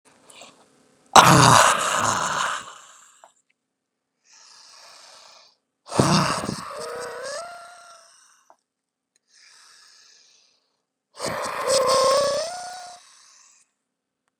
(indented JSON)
{
  "exhalation_length": "14.4 s",
  "exhalation_amplitude": 32768,
  "exhalation_signal_mean_std_ratio": 0.36,
  "survey_phase": "beta (2021-08-13 to 2022-03-07)",
  "age": "45-64",
  "gender": "Male",
  "wearing_mask": "No",
  "symptom_runny_or_blocked_nose": true,
  "symptom_change_to_sense_of_smell_or_taste": true,
  "symptom_loss_of_taste": true,
  "smoker_status": "Never smoked",
  "respiratory_condition_asthma": false,
  "respiratory_condition_other": false,
  "recruitment_source": "Test and Trace",
  "submission_delay": "1 day",
  "covid_test_result": "Positive",
  "covid_test_method": "RT-qPCR",
  "covid_ct_value": 15.2,
  "covid_ct_gene": "ORF1ab gene",
  "covid_ct_mean": 15.8,
  "covid_viral_load": "6600000 copies/ml",
  "covid_viral_load_category": "High viral load (>1M copies/ml)"
}